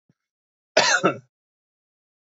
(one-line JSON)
{"cough_length": "2.3 s", "cough_amplitude": 27468, "cough_signal_mean_std_ratio": 0.3, "survey_phase": "beta (2021-08-13 to 2022-03-07)", "age": "18-44", "gender": "Male", "wearing_mask": "No", "symptom_cough_any": true, "symptom_runny_or_blocked_nose": true, "symptom_sore_throat": true, "symptom_fatigue": true, "symptom_fever_high_temperature": true, "symptom_headache": true, "smoker_status": "Never smoked", "respiratory_condition_asthma": false, "respiratory_condition_other": false, "recruitment_source": "Test and Trace", "submission_delay": "1 day", "covid_test_result": "Positive", "covid_test_method": "LFT"}